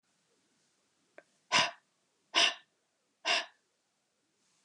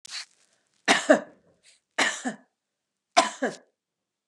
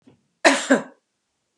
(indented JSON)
{
  "exhalation_length": "4.6 s",
  "exhalation_amplitude": 8199,
  "exhalation_signal_mean_std_ratio": 0.27,
  "three_cough_length": "4.3 s",
  "three_cough_amplitude": 25883,
  "three_cough_signal_mean_std_ratio": 0.31,
  "cough_length": "1.6 s",
  "cough_amplitude": 31695,
  "cough_signal_mean_std_ratio": 0.32,
  "survey_phase": "beta (2021-08-13 to 2022-03-07)",
  "age": "45-64",
  "gender": "Female",
  "wearing_mask": "No",
  "symptom_none": true,
  "smoker_status": "Never smoked",
  "respiratory_condition_asthma": false,
  "respiratory_condition_other": false,
  "recruitment_source": "Test and Trace",
  "submission_delay": "1 day",
  "covid_test_result": "Negative",
  "covid_test_method": "LFT"
}